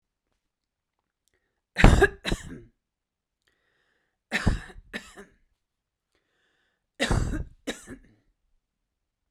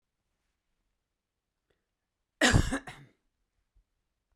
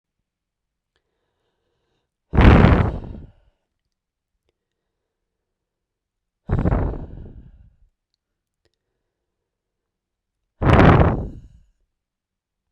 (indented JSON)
{
  "three_cough_length": "9.3 s",
  "three_cough_amplitude": 32768,
  "three_cough_signal_mean_std_ratio": 0.24,
  "cough_length": "4.4 s",
  "cough_amplitude": 10394,
  "cough_signal_mean_std_ratio": 0.22,
  "exhalation_length": "12.7 s",
  "exhalation_amplitude": 32768,
  "exhalation_signal_mean_std_ratio": 0.28,
  "survey_phase": "beta (2021-08-13 to 2022-03-07)",
  "age": "45-64",
  "gender": "Female",
  "wearing_mask": "No",
  "symptom_none": true,
  "smoker_status": "Never smoked",
  "respiratory_condition_asthma": false,
  "respiratory_condition_other": false,
  "recruitment_source": "REACT",
  "submission_delay": "2 days",
  "covid_test_result": "Negative",
  "covid_test_method": "RT-qPCR"
}